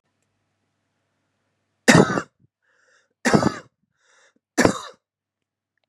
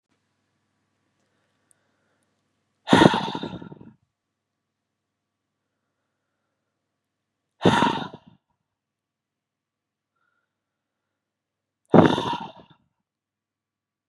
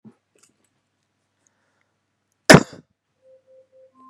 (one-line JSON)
{"three_cough_length": "5.9 s", "three_cough_amplitude": 32768, "three_cough_signal_mean_std_ratio": 0.25, "exhalation_length": "14.1 s", "exhalation_amplitude": 32767, "exhalation_signal_mean_std_ratio": 0.2, "cough_length": "4.1 s", "cough_amplitude": 32768, "cough_signal_mean_std_ratio": 0.13, "survey_phase": "beta (2021-08-13 to 2022-03-07)", "age": "18-44", "gender": "Male", "wearing_mask": "No", "symptom_none": true, "smoker_status": "Ex-smoker", "respiratory_condition_asthma": false, "respiratory_condition_other": false, "recruitment_source": "REACT", "submission_delay": "1 day", "covid_test_result": "Negative", "covid_test_method": "RT-qPCR", "influenza_a_test_result": "Unknown/Void", "influenza_b_test_result": "Unknown/Void"}